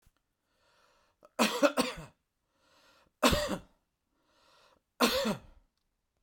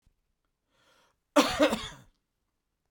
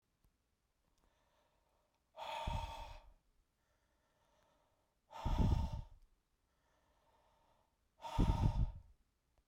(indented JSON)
{
  "three_cough_length": "6.2 s",
  "three_cough_amplitude": 12263,
  "three_cough_signal_mean_std_ratio": 0.33,
  "cough_length": "2.9 s",
  "cough_amplitude": 13076,
  "cough_signal_mean_std_ratio": 0.27,
  "exhalation_length": "9.5 s",
  "exhalation_amplitude": 3239,
  "exhalation_signal_mean_std_ratio": 0.34,
  "survey_phase": "beta (2021-08-13 to 2022-03-07)",
  "age": "45-64",
  "gender": "Male",
  "wearing_mask": "No",
  "symptom_none": true,
  "smoker_status": "Never smoked",
  "respiratory_condition_asthma": false,
  "respiratory_condition_other": false,
  "recruitment_source": "REACT",
  "submission_delay": "3 days",
  "covid_test_result": "Negative",
  "covid_test_method": "RT-qPCR",
  "influenza_a_test_result": "Negative",
  "influenza_b_test_result": "Negative"
}